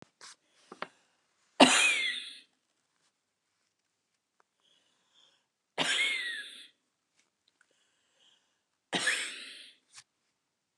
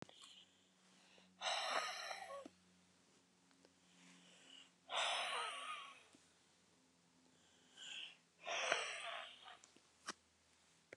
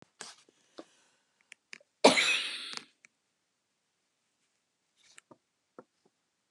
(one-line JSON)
{"three_cough_length": "10.8 s", "three_cough_amplitude": 19158, "three_cough_signal_mean_std_ratio": 0.28, "exhalation_length": "11.0 s", "exhalation_amplitude": 4462, "exhalation_signal_mean_std_ratio": 0.48, "cough_length": "6.5 s", "cough_amplitude": 20634, "cough_signal_mean_std_ratio": 0.2, "survey_phase": "beta (2021-08-13 to 2022-03-07)", "age": "65+", "gender": "Female", "wearing_mask": "No", "symptom_fatigue": true, "smoker_status": "Ex-smoker", "respiratory_condition_asthma": false, "respiratory_condition_other": false, "recruitment_source": "Test and Trace", "submission_delay": "2 days", "covid_test_result": "Positive", "covid_test_method": "RT-qPCR", "covid_ct_value": 20.1, "covid_ct_gene": "ORF1ab gene", "covid_ct_mean": 21.2, "covid_viral_load": "110000 copies/ml", "covid_viral_load_category": "Low viral load (10K-1M copies/ml)"}